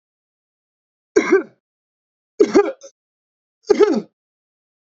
{"three_cough_length": "4.9 s", "three_cough_amplitude": 31532, "three_cough_signal_mean_std_ratio": 0.3, "survey_phase": "beta (2021-08-13 to 2022-03-07)", "age": "45-64", "gender": "Male", "wearing_mask": "No", "symptom_none": true, "smoker_status": "Ex-smoker", "respiratory_condition_asthma": false, "respiratory_condition_other": false, "recruitment_source": "REACT", "submission_delay": "0 days", "covid_test_method": "RT-qPCR"}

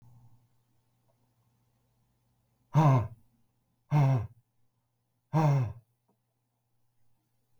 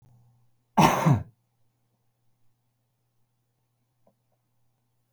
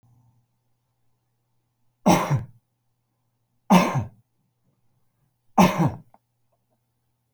{"exhalation_length": "7.6 s", "exhalation_amplitude": 7309, "exhalation_signal_mean_std_ratio": 0.32, "cough_length": "5.1 s", "cough_amplitude": 18056, "cough_signal_mean_std_ratio": 0.23, "three_cough_length": "7.3 s", "three_cough_amplitude": 26942, "three_cough_signal_mean_std_ratio": 0.28, "survey_phase": "beta (2021-08-13 to 2022-03-07)", "age": "65+", "gender": "Male", "wearing_mask": "No", "symptom_none": true, "symptom_onset": "12 days", "smoker_status": "Never smoked", "respiratory_condition_asthma": false, "respiratory_condition_other": false, "recruitment_source": "REACT", "submission_delay": "1 day", "covid_test_result": "Negative", "covid_test_method": "RT-qPCR", "influenza_a_test_result": "Unknown/Void", "influenza_b_test_result": "Unknown/Void"}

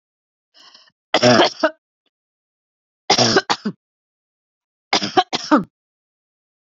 {"three_cough_length": "6.7 s", "three_cough_amplitude": 32257, "three_cough_signal_mean_std_ratio": 0.33, "survey_phase": "beta (2021-08-13 to 2022-03-07)", "age": "65+", "gender": "Female", "wearing_mask": "No", "symptom_none": true, "smoker_status": "Ex-smoker", "respiratory_condition_asthma": false, "respiratory_condition_other": false, "recruitment_source": "REACT", "submission_delay": "0 days", "covid_test_result": "Negative", "covid_test_method": "RT-qPCR", "influenza_a_test_result": "Negative", "influenza_b_test_result": "Negative"}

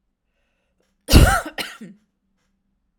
{"cough_length": "3.0 s", "cough_amplitude": 32768, "cough_signal_mean_std_ratio": 0.27, "survey_phase": "alpha (2021-03-01 to 2021-08-12)", "age": "18-44", "gender": "Female", "wearing_mask": "No", "symptom_none": true, "smoker_status": "Never smoked", "respiratory_condition_asthma": false, "respiratory_condition_other": false, "recruitment_source": "REACT", "submission_delay": "2 days", "covid_test_result": "Negative", "covid_test_method": "RT-qPCR"}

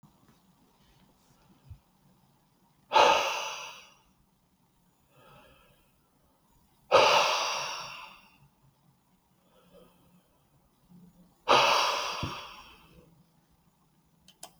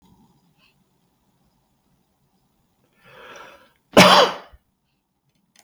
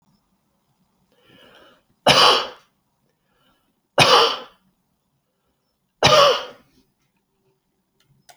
{"exhalation_length": "14.6 s", "exhalation_amplitude": 12953, "exhalation_signal_mean_std_ratio": 0.31, "cough_length": "5.6 s", "cough_amplitude": 31518, "cough_signal_mean_std_ratio": 0.21, "three_cough_length": "8.4 s", "three_cough_amplitude": 32768, "three_cough_signal_mean_std_ratio": 0.3, "survey_phase": "beta (2021-08-13 to 2022-03-07)", "age": "45-64", "gender": "Male", "wearing_mask": "No", "symptom_none": true, "smoker_status": "Never smoked", "respiratory_condition_asthma": false, "respiratory_condition_other": false, "recruitment_source": "REACT", "submission_delay": "3 days", "covid_test_result": "Negative", "covid_test_method": "RT-qPCR"}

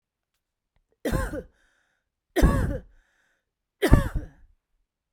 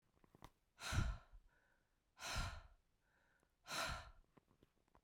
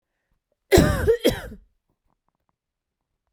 {"three_cough_length": "5.1 s", "three_cough_amplitude": 32767, "three_cough_signal_mean_std_ratio": 0.31, "exhalation_length": "5.0 s", "exhalation_amplitude": 1304, "exhalation_signal_mean_std_ratio": 0.4, "cough_length": "3.3 s", "cough_amplitude": 30731, "cough_signal_mean_std_ratio": 0.32, "survey_phase": "beta (2021-08-13 to 2022-03-07)", "age": "45-64", "gender": "Female", "wearing_mask": "No", "symptom_none": true, "smoker_status": "Never smoked", "respiratory_condition_asthma": true, "respiratory_condition_other": false, "recruitment_source": "REACT", "submission_delay": "1 day", "covid_test_result": "Negative", "covid_test_method": "RT-qPCR", "influenza_a_test_result": "Unknown/Void", "influenza_b_test_result": "Unknown/Void"}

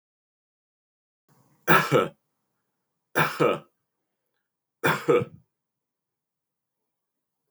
{"three_cough_length": "7.5 s", "three_cough_amplitude": 19538, "three_cough_signal_mean_std_ratio": 0.28, "survey_phase": "beta (2021-08-13 to 2022-03-07)", "age": "65+", "gender": "Male", "wearing_mask": "No", "symptom_none": true, "smoker_status": "Never smoked", "respiratory_condition_asthma": false, "respiratory_condition_other": false, "recruitment_source": "REACT", "submission_delay": "3 days", "covid_test_result": "Negative", "covid_test_method": "RT-qPCR", "influenza_a_test_result": "Negative", "influenza_b_test_result": "Negative"}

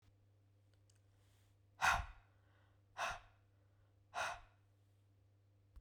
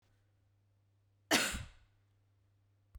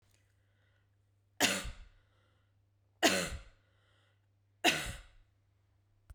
{"exhalation_length": "5.8 s", "exhalation_amplitude": 3054, "exhalation_signal_mean_std_ratio": 0.3, "cough_length": "3.0 s", "cough_amplitude": 6982, "cough_signal_mean_std_ratio": 0.26, "three_cough_length": "6.1 s", "three_cough_amplitude": 8929, "three_cough_signal_mean_std_ratio": 0.29, "survey_phase": "beta (2021-08-13 to 2022-03-07)", "age": "18-44", "gender": "Female", "wearing_mask": "No", "symptom_sore_throat": true, "smoker_status": "Never smoked", "respiratory_condition_asthma": false, "respiratory_condition_other": false, "recruitment_source": "Test and Trace", "submission_delay": "2 days", "covid_test_result": "Positive", "covid_test_method": "RT-qPCR", "covid_ct_value": 35.0, "covid_ct_gene": "N gene"}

